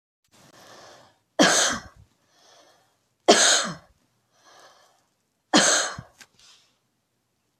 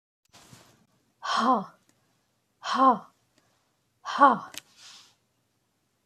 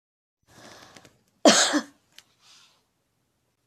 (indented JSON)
{
  "three_cough_length": "7.6 s",
  "three_cough_amplitude": 26316,
  "three_cough_signal_mean_std_ratio": 0.31,
  "exhalation_length": "6.1 s",
  "exhalation_amplitude": 20120,
  "exhalation_signal_mean_std_ratio": 0.29,
  "cough_length": "3.7 s",
  "cough_amplitude": 26688,
  "cough_signal_mean_std_ratio": 0.24,
  "survey_phase": "beta (2021-08-13 to 2022-03-07)",
  "age": "45-64",
  "gender": "Female",
  "wearing_mask": "No",
  "symptom_change_to_sense_of_smell_or_taste": true,
  "symptom_onset": "12 days",
  "smoker_status": "Never smoked",
  "respiratory_condition_asthma": false,
  "respiratory_condition_other": false,
  "recruitment_source": "REACT",
  "submission_delay": "3 days",
  "covid_test_result": "Negative",
  "covid_test_method": "RT-qPCR"
}